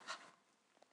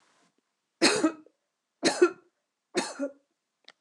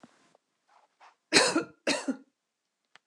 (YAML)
exhalation_length: 0.9 s
exhalation_amplitude: 639
exhalation_signal_mean_std_ratio: 0.43
three_cough_length: 3.8 s
three_cough_amplitude: 13090
three_cough_signal_mean_std_ratio: 0.33
cough_length: 3.1 s
cough_amplitude: 18317
cough_signal_mean_std_ratio: 0.31
survey_phase: beta (2021-08-13 to 2022-03-07)
age: 45-64
gender: Female
wearing_mask: 'No'
symptom_none: true
smoker_status: Never smoked
respiratory_condition_asthma: false
respiratory_condition_other: false
recruitment_source: REACT
submission_delay: 1 day
covid_test_result: Negative
covid_test_method: RT-qPCR
influenza_a_test_result: Negative
influenza_b_test_result: Negative